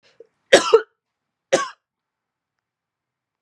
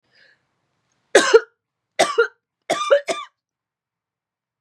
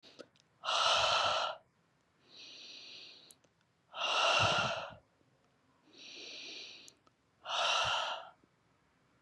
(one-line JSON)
{"cough_length": "3.4 s", "cough_amplitude": 32768, "cough_signal_mean_std_ratio": 0.22, "three_cough_length": "4.6 s", "three_cough_amplitude": 32602, "three_cough_signal_mean_std_ratio": 0.3, "exhalation_length": "9.2 s", "exhalation_amplitude": 4771, "exhalation_signal_mean_std_ratio": 0.49, "survey_phase": "beta (2021-08-13 to 2022-03-07)", "age": "45-64", "gender": "Female", "wearing_mask": "No", "symptom_headache": true, "smoker_status": "Never smoked", "respiratory_condition_asthma": false, "respiratory_condition_other": false, "recruitment_source": "Test and Trace", "submission_delay": "2 days", "covid_test_result": "Positive", "covid_test_method": "RT-qPCR", "covid_ct_value": 27.6, "covid_ct_gene": "ORF1ab gene"}